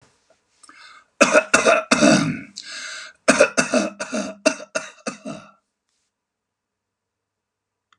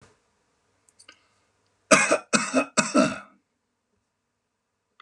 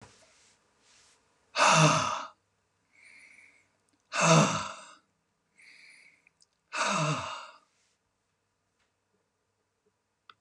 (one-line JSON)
{"cough_length": "8.0 s", "cough_amplitude": 32542, "cough_signal_mean_std_ratio": 0.37, "three_cough_length": "5.0 s", "three_cough_amplitude": 28244, "three_cough_signal_mean_std_ratio": 0.3, "exhalation_length": "10.4 s", "exhalation_amplitude": 14304, "exhalation_signal_mean_std_ratio": 0.32, "survey_phase": "beta (2021-08-13 to 2022-03-07)", "age": "65+", "gender": "Male", "wearing_mask": "No", "symptom_none": true, "smoker_status": "Never smoked", "respiratory_condition_asthma": true, "respiratory_condition_other": false, "recruitment_source": "REACT", "submission_delay": "3 days", "covid_test_result": "Negative", "covid_test_method": "RT-qPCR", "influenza_a_test_result": "Negative", "influenza_b_test_result": "Negative"}